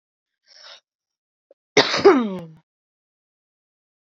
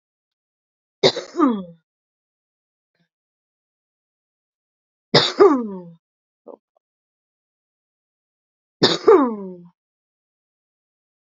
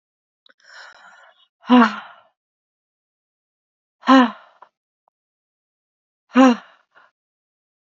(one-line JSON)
{"cough_length": "4.0 s", "cough_amplitude": 29802, "cough_signal_mean_std_ratio": 0.26, "three_cough_length": "11.3 s", "three_cough_amplitude": 29461, "three_cough_signal_mean_std_ratio": 0.25, "exhalation_length": "7.9 s", "exhalation_amplitude": 29988, "exhalation_signal_mean_std_ratio": 0.24, "survey_phase": "beta (2021-08-13 to 2022-03-07)", "age": "18-44", "gender": "Female", "wearing_mask": "No", "symptom_none": true, "smoker_status": "Current smoker (1 to 10 cigarettes per day)", "respiratory_condition_asthma": true, "respiratory_condition_other": false, "recruitment_source": "Test and Trace", "submission_delay": "2 days", "covid_test_result": "Positive", "covid_test_method": "RT-qPCR", "covid_ct_value": 24.6, "covid_ct_gene": "N gene"}